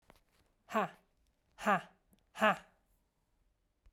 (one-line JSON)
{"exhalation_length": "3.9 s", "exhalation_amplitude": 6043, "exhalation_signal_mean_std_ratio": 0.27, "survey_phase": "beta (2021-08-13 to 2022-03-07)", "age": "45-64", "gender": "Female", "wearing_mask": "No", "symptom_cough_any": true, "symptom_runny_or_blocked_nose": true, "symptom_sore_throat": true, "symptom_fever_high_temperature": true, "symptom_headache": true, "symptom_change_to_sense_of_smell_or_taste": true, "symptom_loss_of_taste": true, "symptom_onset": "5 days", "smoker_status": "Ex-smoker", "respiratory_condition_asthma": false, "respiratory_condition_other": false, "recruitment_source": "Test and Trace", "submission_delay": "2 days", "covid_test_result": "Positive", "covid_test_method": "RT-qPCR"}